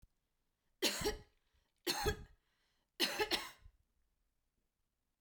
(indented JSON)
{
  "three_cough_length": "5.2 s",
  "three_cough_amplitude": 3341,
  "three_cough_signal_mean_std_ratio": 0.36,
  "survey_phase": "beta (2021-08-13 to 2022-03-07)",
  "age": "18-44",
  "gender": "Female",
  "wearing_mask": "No",
  "symptom_shortness_of_breath": true,
  "symptom_fatigue": true,
  "smoker_status": "Ex-smoker",
  "respiratory_condition_asthma": false,
  "respiratory_condition_other": false,
  "recruitment_source": "Test and Trace",
  "submission_delay": "2 days",
  "covid_test_result": "Positive",
  "covid_test_method": "LFT"
}